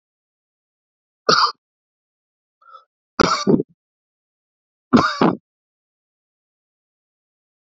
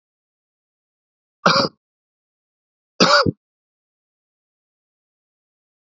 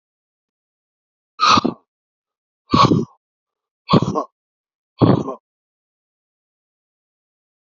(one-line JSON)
{"three_cough_length": "7.7 s", "three_cough_amplitude": 30091, "three_cough_signal_mean_std_ratio": 0.26, "cough_length": "5.8 s", "cough_amplitude": 27444, "cough_signal_mean_std_ratio": 0.23, "exhalation_length": "7.8 s", "exhalation_amplitude": 32768, "exhalation_signal_mean_std_ratio": 0.29, "survey_phase": "beta (2021-08-13 to 2022-03-07)", "age": "45-64", "gender": "Male", "wearing_mask": "No", "symptom_runny_or_blocked_nose": true, "symptom_sore_throat": true, "symptom_change_to_sense_of_smell_or_taste": true, "smoker_status": "Ex-smoker", "respiratory_condition_asthma": false, "respiratory_condition_other": false, "recruitment_source": "Test and Trace", "submission_delay": "1 day", "covid_test_result": "Positive", "covid_test_method": "LFT"}